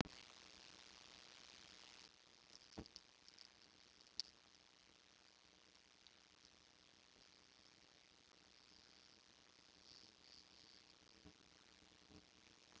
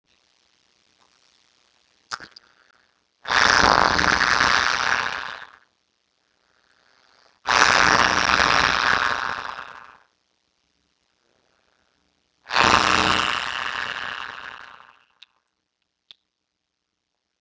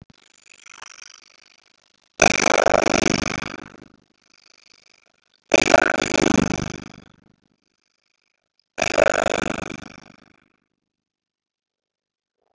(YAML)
cough_length: 12.8 s
cough_amplitude: 3248
cough_signal_mean_std_ratio: 0.29
exhalation_length: 17.4 s
exhalation_amplitude: 32612
exhalation_signal_mean_std_ratio: 0.27
three_cough_length: 12.5 s
three_cough_amplitude: 32768
three_cough_signal_mean_std_ratio: 0.25
survey_phase: beta (2021-08-13 to 2022-03-07)
age: 65+
gender: Male
wearing_mask: 'No'
symptom_none: true
smoker_status: Ex-smoker
respiratory_condition_asthma: false
respiratory_condition_other: false
recruitment_source: REACT
submission_delay: 1 day
covid_test_result: Negative
covid_test_method: RT-qPCR
influenza_a_test_result: Negative
influenza_b_test_result: Negative